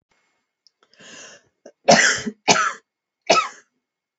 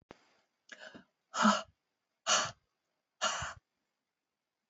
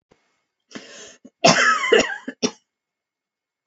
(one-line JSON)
{"three_cough_length": "4.2 s", "three_cough_amplitude": 31048, "three_cough_signal_mean_std_ratio": 0.33, "exhalation_length": "4.7 s", "exhalation_amplitude": 7216, "exhalation_signal_mean_std_ratio": 0.3, "cough_length": "3.7 s", "cough_amplitude": 29826, "cough_signal_mean_std_ratio": 0.36, "survey_phase": "alpha (2021-03-01 to 2021-08-12)", "age": "45-64", "gender": "Female", "wearing_mask": "No", "symptom_none": true, "symptom_onset": "13 days", "smoker_status": "Never smoked", "respiratory_condition_asthma": false, "respiratory_condition_other": false, "recruitment_source": "REACT", "submission_delay": "1 day", "covid_test_result": "Negative", "covid_test_method": "RT-qPCR"}